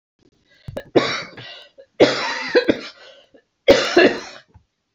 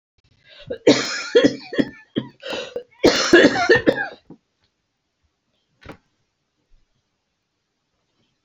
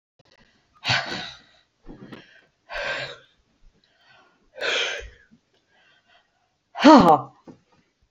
{"three_cough_length": "4.9 s", "three_cough_amplitude": 32768, "three_cough_signal_mean_std_ratio": 0.39, "cough_length": "8.4 s", "cough_amplitude": 32768, "cough_signal_mean_std_ratio": 0.33, "exhalation_length": "8.1 s", "exhalation_amplitude": 28302, "exhalation_signal_mean_std_ratio": 0.26, "survey_phase": "beta (2021-08-13 to 2022-03-07)", "age": "65+", "gender": "Female", "wearing_mask": "No", "symptom_none": true, "smoker_status": "Never smoked", "respiratory_condition_asthma": false, "respiratory_condition_other": false, "recruitment_source": "REACT", "submission_delay": "2 days", "covid_test_result": "Negative", "covid_test_method": "RT-qPCR"}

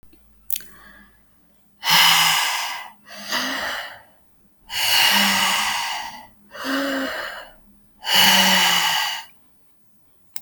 {"exhalation_length": "10.4 s", "exhalation_amplitude": 32768, "exhalation_signal_mean_std_ratio": 0.58, "survey_phase": "alpha (2021-03-01 to 2021-08-12)", "age": "45-64", "gender": "Female", "wearing_mask": "No", "symptom_none": true, "smoker_status": "Ex-smoker", "respiratory_condition_asthma": false, "respiratory_condition_other": false, "recruitment_source": "REACT", "submission_delay": "1 day", "covid_test_result": "Negative", "covid_test_method": "RT-qPCR"}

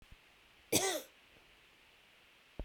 {"cough_length": "2.6 s", "cough_amplitude": 5660, "cough_signal_mean_std_ratio": 0.32, "survey_phase": "beta (2021-08-13 to 2022-03-07)", "age": "45-64", "gender": "Female", "wearing_mask": "No", "symptom_cough_any": true, "symptom_runny_or_blocked_nose": true, "symptom_fatigue": true, "symptom_onset": "3 days", "smoker_status": "Never smoked", "respiratory_condition_asthma": false, "respiratory_condition_other": false, "recruitment_source": "Test and Trace", "submission_delay": "2 days", "covid_test_result": "Positive", "covid_test_method": "RT-qPCR", "covid_ct_value": 18.2, "covid_ct_gene": "ORF1ab gene", "covid_ct_mean": 19.5, "covid_viral_load": "410000 copies/ml", "covid_viral_load_category": "Low viral load (10K-1M copies/ml)"}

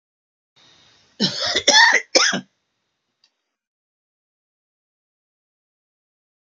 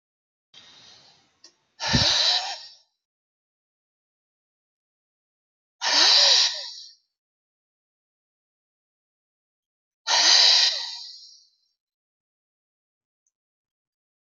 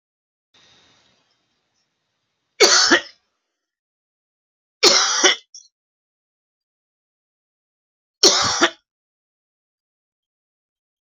{"cough_length": "6.5 s", "cough_amplitude": 30423, "cough_signal_mean_std_ratio": 0.28, "exhalation_length": "14.3 s", "exhalation_amplitude": 21089, "exhalation_signal_mean_std_ratio": 0.32, "three_cough_length": "11.0 s", "three_cough_amplitude": 32767, "three_cough_signal_mean_std_ratio": 0.27, "survey_phase": "beta (2021-08-13 to 2022-03-07)", "age": "65+", "gender": "Male", "wearing_mask": "No", "symptom_cough_any": true, "symptom_new_continuous_cough": true, "symptom_runny_or_blocked_nose": true, "symptom_sore_throat": true, "symptom_onset": "12 days", "smoker_status": "Ex-smoker", "respiratory_condition_asthma": false, "respiratory_condition_other": false, "recruitment_source": "REACT", "submission_delay": "1 day", "covid_test_result": "Negative", "covid_test_method": "RT-qPCR"}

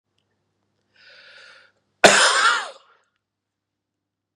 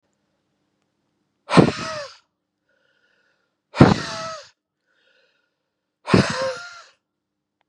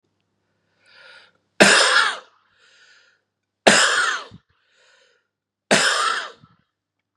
{"cough_length": "4.4 s", "cough_amplitude": 32768, "cough_signal_mean_std_ratio": 0.28, "exhalation_length": "7.7 s", "exhalation_amplitude": 32768, "exhalation_signal_mean_std_ratio": 0.25, "three_cough_length": "7.2 s", "three_cough_amplitude": 32768, "three_cough_signal_mean_std_ratio": 0.37, "survey_phase": "beta (2021-08-13 to 2022-03-07)", "age": "45-64", "gender": "Male", "wearing_mask": "No", "symptom_runny_or_blocked_nose": true, "symptom_change_to_sense_of_smell_or_taste": true, "symptom_loss_of_taste": true, "symptom_other": true, "smoker_status": "Never smoked", "respiratory_condition_asthma": false, "respiratory_condition_other": false, "recruitment_source": "Test and Trace", "submission_delay": "2 days", "covid_test_result": "Positive", "covid_test_method": "RT-qPCR", "covid_ct_value": 17.8, "covid_ct_gene": "S gene", "covid_ct_mean": 18.7, "covid_viral_load": "740000 copies/ml", "covid_viral_load_category": "Low viral load (10K-1M copies/ml)"}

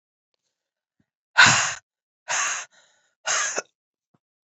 {"exhalation_length": "4.4 s", "exhalation_amplitude": 28341, "exhalation_signal_mean_std_ratio": 0.32, "survey_phase": "beta (2021-08-13 to 2022-03-07)", "age": "18-44", "gender": "Female", "wearing_mask": "No", "symptom_new_continuous_cough": true, "symptom_runny_or_blocked_nose": true, "symptom_fatigue": true, "symptom_headache": true, "symptom_change_to_sense_of_smell_or_taste": true, "symptom_loss_of_taste": true, "symptom_other": true, "symptom_onset": "4 days", "smoker_status": "Ex-smoker", "respiratory_condition_asthma": false, "respiratory_condition_other": false, "recruitment_source": "Test and Trace", "submission_delay": "2 days", "covid_test_result": "Positive", "covid_test_method": "RT-qPCR", "covid_ct_value": 12.2, "covid_ct_gene": "ORF1ab gene", "covid_ct_mean": 12.6, "covid_viral_load": "71000000 copies/ml", "covid_viral_load_category": "High viral load (>1M copies/ml)"}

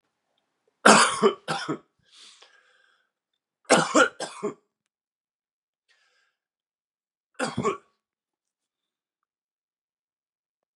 {"three_cough_length": "10.8 s", "three_cough_amplitude": 32161, "three_cough_signal_mean_std_ratio": 0.24, "survey_phase": "beta (2021-08-13 to 2022-03-07)", "age": "45-64", "gender": "Male", "wearing_mask": "No", "symptom_cough_any": true, "symptom_runny_or_blocked_nose": true, "symptom_sore_throat": true, "symptom_abdominal_pain": true, "symptom_fatigue": true, "symptom_onset": "3 days", "smoker_status": "Never smoked", "respiratory_condition_asthma": false, "respiratory_condition_other": false, "recruitment_source": "Test and Trace", "submission_delay": "2 days", "covid_test_result": "Positive", "covid_test_method": "RT-qPCR", "covid_ct_value": 19.3, "covid_ct_gene": "ORF1ab gene", "covid_ct_mean": 19.3, "covid_viral_load": "460000 copies/ml", "covid_viral_load_category": "Low viral load (10K-1M copies/ml)"}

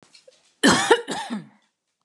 {"cough_length": "2.0 s", "cough_amplitude": 23831, "cough_signal_mean_std_ratio": 0.39, "survey_phase": "beta (2021-08-13 to 2022-03-07)", "age": "45-64", "gender": "Female", "wearing_mask": "No", "symptom_none": true, "smoker_status": "Never smoked", "respiratory_condition_asthma": false, "respiratory_condition_other": false, "recruitment_source": "REACT", "submission_delay": "1 day", "covid_test_result": "Negative", "covid_test_method": "RT-qPCR", "influenza_a_test_result": "Negative", "influenza_b_test_result": "Negative"}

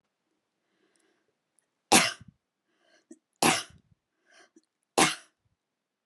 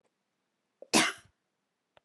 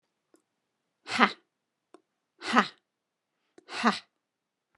{"three_cough_length": "6.1 s", "three_cough_amplitude": 21648, "three_cough_signal_mean_std_ratio": 0.22, "cough_length": "2.0 s", "cough_amplitude": 13461, "cough_signal_mean_std_ratio": 0.23, "exhalation_length": "4.8 s", "exhalation_amplitude": 25902, "exhalation_signal_mean_std_ratio": 0.23, "survey_phase": "beta (2021-08-13 to 2022-03-07)", "age": "45-64", "gender": "Female", "wearing_mask": "No", "symptom_fatigue": true, "symptom_onset": "11 days", "smoker_status": "Never smoked", "respiratory_condition_asthma": false, "respiratory_condition_other": false, "recruitment_source": "REACT", "submission_delay": "1 day", "covid_test_result": "Negative", "covid_test_method": "RT-qPCR"}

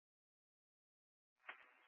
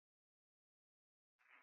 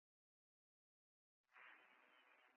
{"cough_length": "1.9 s", "cough_amplitude": 475, "cough_signal_mean_std_ratio": 0.23, "exhalation_length": "1.6 s", "exhalation_amplitude": 81, "exhalation_signal_mean_std_ratio": 0.25, "three_cough_length": "2.6 s", "three_cough_amplitude": 92, "three_cough_signal_mean_std_ratio": 0.46, "survey_phase": "beta (2021-08-13 to 2022-03-07)", "age": "18-44", "gender": "Female", "wearing_mask": "No", "symptom_none": true, "symptom_onset": "12 days", "smoker_status": "Ex-smoker", "respiratory_condition_asthma": false, "respiratory_condition_other": false, "recruitment_source": "REACT", "submission_delay": "4 days", "covid_test_result": "Negative", "covid_test_method": "RT-qPCR", "influenza_a_test_result": "Negative", "influenza_b_test_result": "Negative"}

